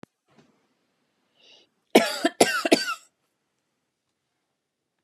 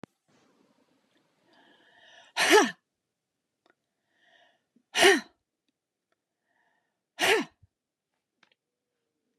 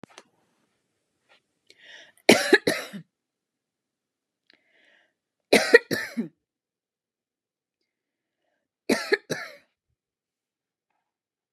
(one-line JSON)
{"cough_length": "5.0 s", "cough_amplitude": 31988, "cough_signal_mean_std_ratio": 0.24, "exhalation_length": "9.4 s", "exhalation_amplitude": 16728, "exhalation_signal_mean_std_ratio": 0.22, "three_cough_length": "11.5 s", "three_cough_amplitude": 32368, "three_cough_signal_mean_std_ratio": 0.2, "survey_phase": "beta (2021-08-13 to 2022-03-07)", "age": "45-64", "gender": "Female", "wearing_mask": "No", "symptom_none": true, "smoker_status": "Never smoked", "respiratory_condition_asthma": false, "respiratory_condition_other": false, "recruitment_source": "REACT", "submission_delay": "4 days", "covid_test_result": "Negative", "covid_test_method": "RT-qPCR", "influenza_a_test_result": "Negative", "influenza_b_test_result": "Negative"}